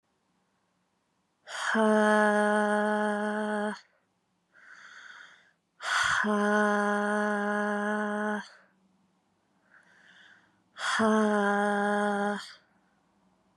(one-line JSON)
{"exhalation_length": "13.6 s", "exhalation_amplitude": 9531, "exhalation_signal_mean_std_ratio": 0.55, "survey_phase": "beta (2021-08-13 to 2022-03-07)", "age": "18-44", "gender": "Female", "wearing_mask": "No", "symptom_cough_any": true, "symptom_runny_or_blocked_nose": true, "symptom_headache": true, "symptom_change_to_sense_of_smell_or_taste": true, "symptom_loss_of_taste": true, "smoker_status": "Never smoked", "respiratory_condition_asthma": true, "respiratory_condition_other": false, "recruitment_source": "Test and Trace", "submission_delay": "2 days", "covid_test_result": "Positive", "covid_test_method": "LAMP"}